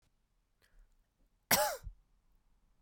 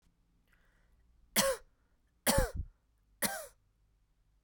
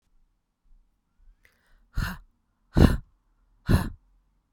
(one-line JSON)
{"cough_length": "2.8 s", "cough_amplitude": 6633, "cough_signal_mean_std_ratio": 0.25, "three_cough_length": "4.4 s", "three_cough_amplitude": 6166, "three_cough_signal_mean_std_ratio": 0.32, "exhalation_length": "4.5 s", "exhalation_amplitude": 23986, "exhalation_signal_mean_std_ratio": 0.25, "survey_phase": "beta (2021-08-13 to 2022-03-07)", "age": "18-44", "gender": "Female", "wearing_mask": "No", "symptom_none": true, "smoker_status": "Ex-smoker", "respiratory_condition_asthma": false, "respiratory_condition_other": false, "recruitment_source": "REACT", "submission_delay": "2 days", "covid_test_result": "Negative", "covid_test_method": "RT-qPCR"}